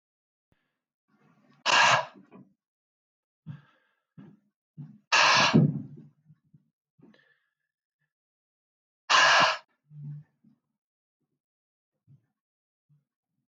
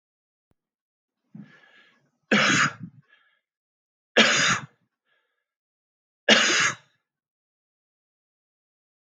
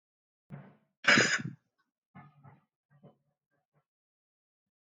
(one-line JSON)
{"exhalation_length": "13.6 s", "exhalation_amplitude": 13602, "exhalation_signal_mean_std_ratio": 0.28, "three_cough_length": "9.1 s", "three_cough_amplitude": 26827, "three_cough_signal_mean_std_ratio": 0.3, "cough_length": "4.9 s", "cough_amplitude": 13334, "cough_signal_mean_std_ratio": 0.22, "survey_phase": "beta (2021-08-13 to 2022-03-07)", "age": "65+", "gender": "Male", "wearing_mask": "No", "symptom_none": true, "smoker_status": "Ex-smoker", "respiratory_condition_asthma": false, "respiratory_condition_other": false, "recruitment_source": "REACT", "submission_delay": "2 days", "covid_test_result": "Negative", "covid_test_method": "RT-qPCR", "influenza_a_test_result": "Negative", "influenza_b_test_result": "Negative"}